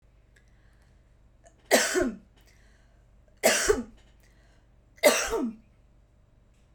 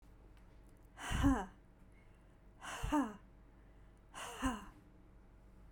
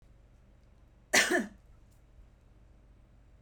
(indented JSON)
{
  "three_cough_length": "6.7 s",
  "three_cough_amplitude": 15498,
  "three_cough_signal_mean_std_ratio": 0.35,
  "exhalation_length": "5.7 s",
  "exhalation_amplitude": 3321,
  "exhalation_signal_mean_std_ratio": 0.42,
  "cough_length": "3.4 s",
  "cough_amplitude": 9115,
  "cough_signal_mean_std_ratio": 0.29,
  "survey_phase": "beta (2021-08-13 to 2022-03-07)",
  "age": "45-64",
  "gender": "Female",
  "wearing_mask": "No",
  "symptom_none": true,
  "smoker_status": "Never smoked",
  "respiratory_condition_asthma": false,
  "respiratory_condition_other": false,
  "recruitment_source": "REACT",
  "submission_delay": "1 day",
  "covid_test_result": "Negative",
  "covid_test_method": "RT-qPCR"
}